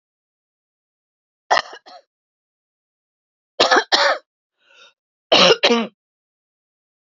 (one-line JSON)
{"three_cough_length": "7.2 s", "three_cough_amplitude": 31753, "three_cough_signal_mean_std_ratio": 0.3, "survey_phase": "beta (2021-08-13 to 2022-03-07)", "age": "45-64", "gender": "Female", "wearing_mask": "No", "symptom_cough_any": true, "symptom_runny_or_blocked_nose": true, "symptom_headache": true, "symptom_loss_of_taste": true, "symptom_other": true, "symptom_onset": "3 days", "smoker_status": "Ex-smoker", "respiratory_condition_asthma": false, "respiratory_condition_other": false, "recruitment_source": "Test and Trace", "submission_delay": "2 days", "covid_test_result": "Positive", "covid_test_method": "RT-qPCR", "covid_ct_value": 17.4, "covid_ct_gene": "ORF1ab gene", "covid_ct_mean": 18.2, "covid_viral_load": "1000000 copies/ml", "covid_viral_load_category": "High viral load (>1M copies/ml)"}